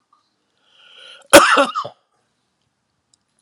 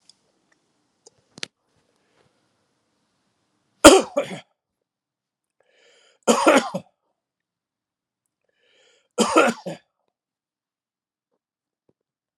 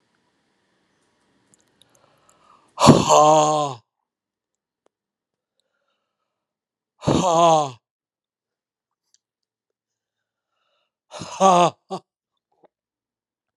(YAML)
cough_length: 3.4 s
cough_amplitude: 32768
cough_signal_mean_std_ratio: 0.26
three_cough_length: 12.4 s
three_cough_amplitude: 32768
three_cough_signal_mean_std_ratio: 0.2
exhalation_length: 13.6 s
exhalation_amplitude: 32768
exhalation_signal_mean_std_ratio: 0.28
survey_phase: beta (2021-08-13 to 2022-03-07)
age: 45-64
gender: Male
wearing_mask: 'No'
symptom_none: true
smoker_status: Never smoked
respiratory_condition_asthma: false
respiratory_condition_other: false
recruitment_source: REACT
submission_delay: 0 days
covid_test_result: Negative
covid_test_method: RT-qPCR